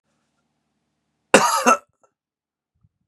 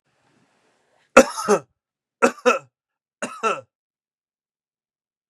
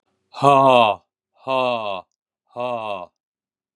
{"cough_length": "3.1 s", "cough_amplitude": 32768, "cough_signal_mean_std_ratio": 0.26, "three_cough_length": "5.3 s", "three_cough_amplitude": 32768, "three_cough_signal_mean_std_ratio": 0.24, "exhalation_length": "3.8 s", "exhalation_amplitude": 29351, "exhalation_signal_mean_std_ratio": 0.41, "survey_phase": "beta (2021-08-13 to 2022-03-07)", "age": "45-64", "gender": "Male", "wearing_mask": "No", "symptom_sore_throat": true, "symptom_fatigue": true, "symptom_onset": "12 days", "smoker_status": "Never smoked", "respiratory_condition_asthma": false, "respiratory_condition_other": false, "recruitment_source": "REACT", "submission_delay": "0 days", "covid_test_result": "Negative", "covid_test_method": "RT-qPCR", "covid_ct_value": 38.0, "covid_ct_gene": "N gene", "influenza_a_test_result": "Negative", "influenza_b_test_result": "Negative"}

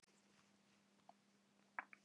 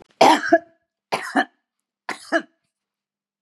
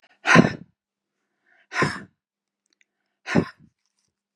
{"cough_length": "2.0 s", "cough_amplitude": 1181, "cough_signal_mean_std_ratio": 0.27, "three_cough_length": "3.4 s", "three_cough_amplitude": 29146, "three_cough_signal_mean_std_ratio": 0.31, "exhalation_length": "4.4 s", "exhalation_amplitude": 27586, "exhalation_signal_mean_std_ratio": 0.25, "survey_phase": "beta (2021-08-13 to 2022-03-07)", "age": "65+", "gender": "Female", "wearing_mask": "No", "symptom_none": true, "smoker_status": "Ex-smoker", "respiratory_condition_asthma": false, "respiratory_condition_other": false, "recruitment_source": "REACT", "submission_delay": "1 day", "covid_test_result": "Negative", "covid_test_method": "RT-qPCR", "influenza_a_test_result": "Negative", "influenza_b_test_result": "Negative"}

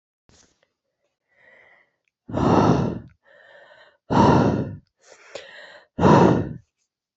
{"exhalation_length": "7.2 s", "exhalation_amplitude": 26073, "exhalation_signal_mean_std_ratio": 0.4, "survey_phase": "beta (2021-08-13 to 2022-03-07)", "age": "18-44", "gender": "Female", "wearing_mask": "No", "symptom_cough_any": true, "symptom_runny_or_blocked_nose": true, "symptom_shortness_of_breath": true, "symptom_fatigue": true, "symptom_fever_high_temperature": true, "symptom_headache": true, "symptom_change_to_sense_of_smell_or_taste": true, "symptom_loss_of_taste": true, "symptom_onset": "4 days", "smoker_status": "Never smoked", "respiratory_condition_asthma": false, "respiratory_condition_other": false, "recruitment_source": "Test and Trace", "submission_delay": "2 days", "covid_test_result": "Positive", "covid_test_method": "RT-qPCR", "covid_ct_value": 16.9, "covid_ct_gene": "ORF1ab gene", "covid_ct_mean": 17.9, "covid_viral_load": "1300000 copies/ml", "covid_viral_load_category": "High viral load (>1M copies/ml)"}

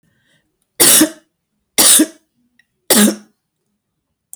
{"three_cough_length": "4.4 s", "three_cough_amplitude": 32768, "three_cough_signal_mean_std_ratio": 0.37, "survey_phase": "beta (2021-08-13 to 2022-03-07)", "age": "65+", "gender": "Female", "wearing_mask": "No", "symptom_none": true, "smoker_status": "Never smoked", "respiratory_condition_asthma": false, "respiratory_condition_other": false, "recruitment_source": "REACT", "submission_delay": "1 day", "covid_test_result": "Negative", "covid_test_method": "RT-qPCR"}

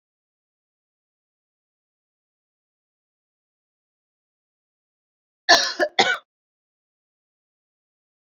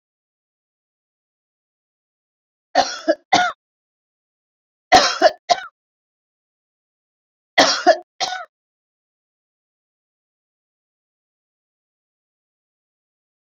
{"cough_length": "8.3 s", "cough_amplitude": 29658, "cough_signal_mean_std_ratio": 0.17, "three_cough_length": "13.5 s", "three_cough_amplitude": 31277, "three_cough_signal_mean_std_ratio": 0.22, "survey_phase": "beta (2021-08-13 to 2022-03-07)", "age": "65+", "gender": "Female", "wearing_mask": "No", "symptom_none": true, "smoker_status": "Ex-smoker", "respiratory_condition_asthma": false, "respiratory_condition_other": false, "recruitment_source": "REACT", "submission_delay": "3 days", "covid_test_result": "Negative", "covid_test_method": "RT-qPCR"}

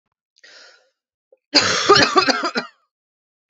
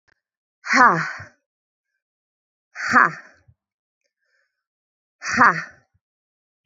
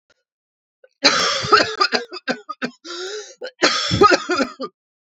{"cough_length": "3.5 s", "cough_amplitude": 31110, "cough_signal_mean_std_ratio": 0.4, "exhalation_length": "6.7 s", "exhalation_amplitude": 28670, "exhalation_signal_mean_std_ratio": 0.28, "three_cough_length": "5.1 s", "three_cough_amplitude": 32767, "three_cough_signal_mean_std_ratio": 0.48, "survey_phase": "beta (2021-08-13 to 2022-03-07)", "age": "18-44", "gender": "Female", "wearing_mask": "No", "symptom_cough_any": true, "symptom_new_continuous_cough": true, "symptom_shortness_of_breath": true, "symptom_sore_throat": true, "symptom_other": true, "symptom_onset": "3 days", "smoker_status": "Never smoked", "respiratory_condition_asthma": true, "respiratory_condition_other": false, "recruitment_source": "Test and Trace", "submission_delay": "2 days", "covid_test_result": "Positive", "covid_test_method": "RT-qPCR", "covid_ct_value": 23.6, "covid_ct_gene": "ORF1ab gene", "covid_ct_mean": 24.6, "covid_viral_load": "8200 copies/ml", "covid_viral_load_category": "Minimal viral load (< 10K copies/ml)"}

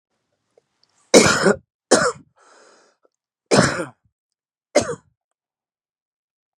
{"three_cough_length": "6.6 s", "three_cough_amplitude": 32768, "three_cough_signal_mean_std_ratio": 0.29, "survey_phase": "beta (2021-08-13 to 2022-03-07)", "age": "45-64", "gender": "Male", "wearing_mask": "No", "symptom_cough_any": true, "symptom_new_continuous_cough": true, "symptom_shortness_of_breath": true, "symptom_sore_throat": true, "symptom_onset": "3 days", "smoker_status": "Never smoked", "respiratory_condition_asthma": false, "respiratory_condition_other": false, "recruitment_source": "Test and Trace", "submission_delay": "2 days", "covid_test_result": "Positive", "covid_test_method": "RT-qPCR", "covid_ct_value": 22.4, "covid_ct_gene": "ORF1ab gene"}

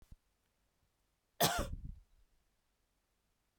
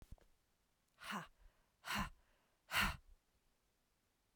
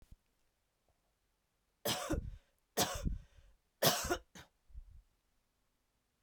{"cough_length": "3.6 s", "cough_amplitude": 5499, "cough_signal_mean_std_ratio": 0.26, "exhalation_length": "4.4 s", "exhalation_amplitude": 2118, "exhalation_signal_mean_std_ratio": 0.32, "three_cough_length": "6.2 s", "three_cough_amplitude": 5887, "three_cough_signal_mean_std_ratio": 0.34, "survey_phase": "beta (2021-08-13 to 2022-03-07)", "age": "45-64", "gender": "Female", "wearing_mask": "No", "symptom_cough_any": true, "symptom_runny_or_blocked_nose": true, "symptom_sore_throat": true, "symptom_fatigue": true, "symptom_headache": true, "symptom_onset": "7 days", "smoker_status": "Never smoked", "respiratory_condition_asthma": false, "respiratory_condition_other": false, "recruitment_source": "Test and Trace", "submission_delay": "1 day", "covid_test_result": "Positive", "covid_test_method": "RT-qPCR", "covid_ct_value": 25.9, "covid_ct_gene": "N gene", "covid_ct_mean": 26.0, "covid_viral_load": "3100 copies/ml", "covid_viral_load_category": "Minimal viral load (< 10K copies/ml)"}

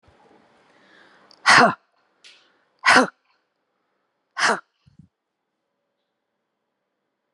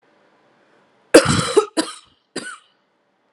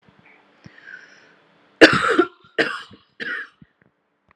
{"exhalation_length": "7.3 s", "exhalation_amplitude": 30404, "exhalation_signal_mean_std_ratio": 0.23, "cough_length": "3.3 s", "cough_amplitude": 32768, "cough_signal_mean_std_ratio": 0.29, "three_cough_length": "4.4 s", "three_cough_amplitude": 32768, "three_cough_signal_mean_std_ratio": 0.28, "survey_phase": "alpha (2021-03-01 to 2021-08-12)", "age": "45-64", "gender": "Female", "wearing_mask": "No", "symptom_none": true, "smoker_status": "Ex-smoker", "respiratory_condition_asthma": false, "respiratory_condition_other": true, "recruitment_source": "REACT", "submission_delay": "5 days", "covid_test_result": "Negative", "covid_test_method": "RT-qPCR"}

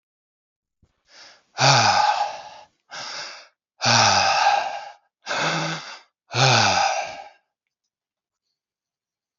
{"exhalation_length": "9.4 s", "exhalation_amplitude": 27573, "exhalation_signal_mean_std_ratio": 0.49, "survey_phase": "beta (2021-08-13 to 2022-03-07)", "age": "18-44", "gender": "Male", "wearing_mask": "No", "symptom_cough_any": true, "symptom_runny_or_blocked_nose": true, "symptom_fatigue": true, "symptom_headache": true, "symptom_change_to_sense_of_smell_or_taste": true, "smoker_status": "Ex-smoker", "respiratory_condition_asthma": false, "respiratory_condition_other": false, "recruitment_source": "Test and Trace", "submission_delay": "1 day", "covid_test_result": "Positive", "covid_test_method": "RT-qPCR"}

